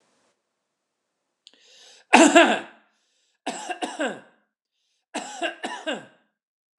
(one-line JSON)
{"three_cough_length": "6.8 s", "three_cough_amplitude": 29204, "three_cough_signal_mean_std_ratio": 0.28, "survey_phase": "beta (2021-08-13 to 2022-03-07)", "age": "65+", "gender": "Male", "wearing_mask": "No", "symptom_fatigue": true, "smoker_status": "Ex-smoker", "respiratory_condition_asthma": false, "respiratory_condition_other": false, "recruitment_source": "REACT", "submission_delay": "2 days", "covid_test_result": "Negative", "covid_test_method": "RT-qPCR"}